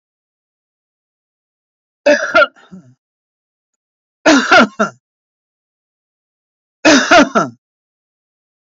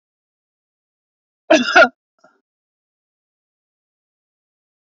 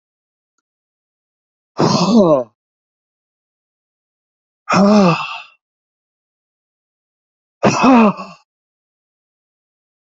{"three_cough_length": "8.7 s", "three_cough_amplitude": 31205, "three_cough_signal_mean_std_ratio": 0.32, "cough_length": "4.9 s", "cough_amplitude": 30751, "cough_signal_mean_std_ratio": 0.2, "exhalation_length": "10.2 s", "exhalation_amplitude": 30767, "exhalation_signal_mean_std_ratio": 0.34, "survey_phase": "beta (2021-08-13 to 2022-03-07)", "age": "45-64", "gender": "Male", "wearing_mask": "Yes", "symptom_none": true, "smoker_status": "Never smoked", "respiratory_condition_asthma": false, "respiratory_condition_other": false, "recruitment_source": "REACT", "submission_delay": "1 day", "covid_test_result": "Negative", "covid_test_method": "RT-qPCR", "influenza_a_test_result": "Negative", "influenza_b_test_result": "Negative"}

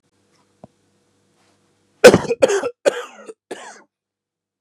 {"three_cough_length": "4.6 s", "three_cough_amplitude": 32768, "three_cough_signal_mean_std_ratio": 0.24, "survey_phase": "beta (2021-08-13 to 2022-03-07)", "age": "45-64", "gender": "Male", "wearing_mask": "No", "symptom_cough_any": true, "symptom_runny_or_blocked_nose": true, "symptom_shortness_of_breath": true, "symptom_sore_throat": true, "symptom_abdominal_pain": true, "symptom_diarrhoea": true, "symptom_fatigue": true, "symptom_headache": true, "symptom_loss_of_taste": true, "symptom_other": true, "smoker_status": "Ex-smoker", "respiratory_condition_asthma": true, "respiratory_condition_other": false, "recruitment_source": "Test and Trace", "submission_delay": "3 days", "covid_test_result": "Positive", "covid_test_method": "LFT"}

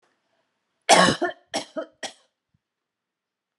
{"cough_length": "3.6 s", "cough_amplitude": 27622, "cough_signal_mean_std_ratio": 0.27, "survey_phase": "beta (2021-08-13 to 2022-03-07)", "age": "65+", "gender": "Female", "wearing_mask": "No", "symptom_none": true, "smoker_status": "Ex-smoker", "respiratory_condition_asthma": false, "respiratory_condition_other": false, "recruitment_source": "REACT", "submission_delay": "3 days", "covid_test_result": "Negative", "covid_test_method": "RT-qPCR"}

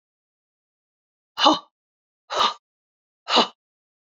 {"exhalation_length": "4.1 s", "exhalation_amplitude": 27381, "exhalation_signal_mean_std_ratio": 0.27, "survey_phase": "beta (2021-08-13 to 2022-03-07)", "age": "65+", "gender": "Female", "wearing_mask": "No", "symptom_cough_any": true, "symptom_runny_or_blocked_nose": true, "symptom_sore_throat": true, "symptom_fatigue": true, "symptom_change_to_sense_of_smell_or_taste": true, "symptom_onset": "3 days", "smoker_status": "Never smoked", "respiratory_condition_asthma": false, "respiratory_condition_other": true, "recruitment_source": "Test and Trace", "submission_delay": "1 day", "covid_test_result": "Positive", "covid_test_method": "RT-qPCR", "covid_ct_value": 18.2, "covid_ct_gene": "N gene"}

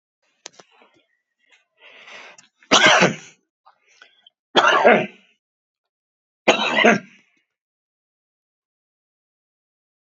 {"three_cough_length": "10.1 s", "three_cough_amplitude": 32458, "three_cough_signal_mean_std_ratio": 0.29, "survey_phase": "beta (2021-08-13 to 2022-03-07)", "age": "65+", "gender": "Female", "wearing_mask": "No", "symptom_runny_or_blocked_nose": true, "symptom_fatigue": true, "symptom_headache": true, "symptom_onset": "6 days", "smoker_status": "Current smoker (e-cigarettes or vapes only)", "respiratory_condition_asthma": false, "respiratory_condition_other": false, "recruitment_source": "Test and Trace", "submission_delay": "2 days", "covid_test_result": "Positive", "covid_test_method": "RT-qPCR", "covid_ct_value": 21.3, "covid_ct_gene": "ORF1ab gene", "covid_ct_mean": 21.9, "covid_viral_load": "64000 copies/ml", "covid_viral_load_category": "Low viral load (10K-1M copies/ml)"}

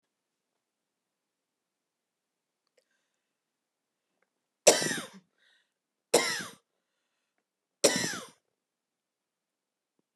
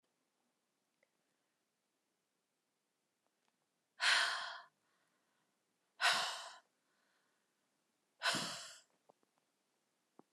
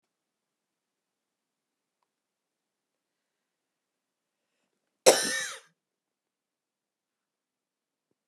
{"three_cough_length": "10.2 s", "three_cough_amplitude": 25263, "three_cough_signal_mean_std_ratio": 0.2, "exhalation_length": "10.3 s", "exhalation_amplitude": 3832, "exhalation_signal_mean_std_ratio": 0.27, "cough_length": "8.3 s", "cough_amplitude": 26124, "cough_signal_mean_std_ratio": 0.13, "survey_phase": "beta (2021-08-13 to 2022-03-07)", "age": "45-64", "gender": "Female", "wearing_mask": "No", "symptom_fatigue": true, "symptom_onset": "12 days", "smoker_status": "Current smoker (11 or more cigarettes per day)", "respiratory_condition_asthma": false, "respiratory_condition_other": false, "recruitment_source": "REACT", "submission_delay": "2 days", "covid_test_result": "Negative", "covid_test_method": "RT-qPCR"}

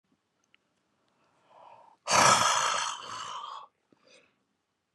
{"exhalation_length": "4.9 s", "exhalation_amplitude": 12769, "exhalation_signal_mean_std_ratio": 0.37, "survey_phase": "beta (2021-08-13 to 2022-03-07)", "age": "65+", "gender": "Male", "wearing_mask": "No", "symptom_none": true, "smoker_status": "Never smoked", "respiratory_condition_asthma": false, "respiratory_condition_other": false, "recruitment_source": "REACT", "submission_delay": "2 days", "covid_test_result": "Negative", "covid_test_method": "RT-qPCR"}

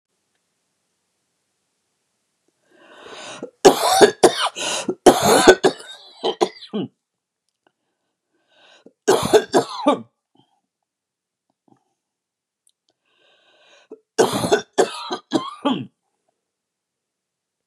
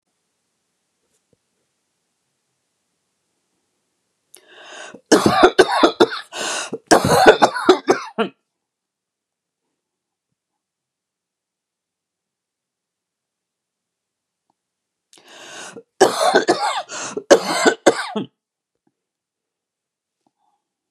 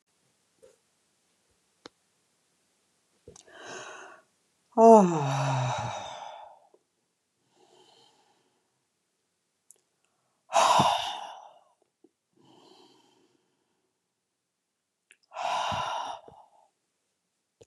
{"three_cough_length": "17.7 s", "three_cough_amplitude": 32768, "three_cough_signal_mean_std_ratio": 0.3, "cough_length": "20.9 s", "cough_amplitude": 32768, "cough_signal_mean_std_ratio": 0.29, "exhalation_length": "17.7 s", "exhalation_amplitude": 21443, "exhalation_signal_mean_std_ratio": 0.26, "survey_phase": "beta (2021-08-13 to 2022-03-07)", "age": "45-64", "gender": "Female", "wearing_mask": "No", "symptom_cough_any": true, "symptom_runny_or_blocked_nose": true, "symptom_fatigue": true, "symptom_headache": true, "smoker_status": "Never smoked", "respiratory_condition_asthma": false, "respiratory_condition_other": false, "recruitment_source": "REACT", "submission_delay": "1 day", "covid_test_result": "Negative", "covid_test_method": "RT-qPCR", "influenza_a_test_result": "Negative", "influenza_b_test_result": "Negative"}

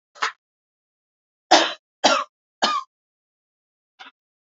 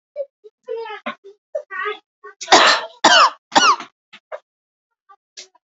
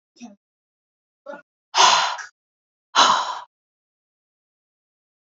{"three_cough_length": "4.4 s", "three_cough_amplitude": 31289, "three_cough_signal_mean_std_ratio": 0.28, "cough_length": "5.6 s", "cough_amplitude": 31215, "cough_signal_mean_std_ratio": 0.37, "exhalation_length": "5.2 s", "exhalation_amplitude": 26332, "exhalation_signal_mean_std_ratio": 0.31, "survey_phase": "beta (2021-08-13 to 2022-03-07)", "age": "18-44", "gender": "Male", "wearing_mask": "No", "symptom_none": true, "symptom_onset": "11 days", "smoker_status": "Current smoker (1 to 10 cigarettes per day)", "respiratory_condition_asthma": false, "respiratory_condition_other": false, "recruitment_source": "REACT", "submission_delay": "1 day", "covid_test_result": "Positive", "covid_test_method": "RT-qPCR", "covid_ct_value": 23.8, "covid_ct_gene": "E gene", "influenza_a_test_result": "Negative", "influenza_b_test_result": "Negative"}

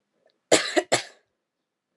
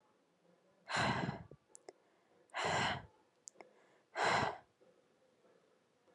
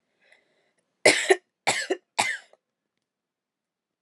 {"cough_length": "2.0 s", "cough_amplitude": 26826, "cough_signal_mean_std_ratio": 0.29, "exhalation_length": "6.1 s", "exhalation_amplitude": 2639, "exhalation_signal_mean_std_ratio": 0.4, "three_cough_length": "4.0 s", "three_cough_amplitude": 28879, "three_cough_signal_mean_std_ratio": 0.27, "survey_phase": "alpha (2021-03-01 to 2021-08-12)", "age": "18-44", "gender": "Female", "wearing_mask": "No", "symptom_fatigue": true, "symptom_fever_high_temperature": true, "symptom_headache": true, "symptom_onset": "4 days", "smoker_status": "Never smoked", "respiratory_condition_asthma": false, "respiratory_condition_other": false, "recruitment_source": "Test and Trace", "submission_delay": "2 days", "covid_test_result": "Positive", "covid_test_method": "RT-qPCR", "covid_ct_value": 23.3, "covid_ct_gene": "ORF1ab gene"}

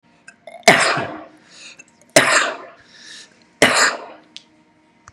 {"three_cough_length": "5.1 s", "three_cough_amplitude": 32768, "three_cough_signal_mean_std_ratio": 0.38, "survey_phase": "beta (2021-08-13 to 2022-03-07)", "age": "18-44", "gender": "Male", "wearing_mask": "No", "symptom_none": true, "smoker_status": "Never smoked", "respiratory_condition_asthma": false, "respiratory_condition_other": false, "recruitment_source": "REACT", "submission_delay": "1 day", "covid_test_result": "Negative", "covid_test_method": "RT-qPCR", "influenza_a_test_result": "Negative", "influenza_b_test_result": "Negative"}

